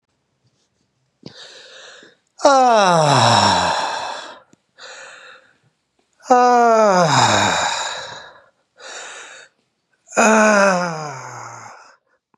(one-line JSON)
{"exhalation_length": "12.4 s", "exhalation_amplitude": 32767, "exhalation_signal_mean_std_ratio": 0.5, "survey_phase": "beta (2021-08-13 to 2022-03-07)", "age": "45-64", "gender": "Male", "wearing_mask": "No", "symptom_none": true, "smoker_status": "Never smoked", "respiratory_condition_asthma": false, "respiratory_condition_other": false, "recruitment_source": "REACT", "submission_delay": "2 days", "covid_test_result": "Negative", "covid_test_method": "RT-qPCR", "influenza_a_test_result": "Negative", "influenza_b_test_result": "Negative"}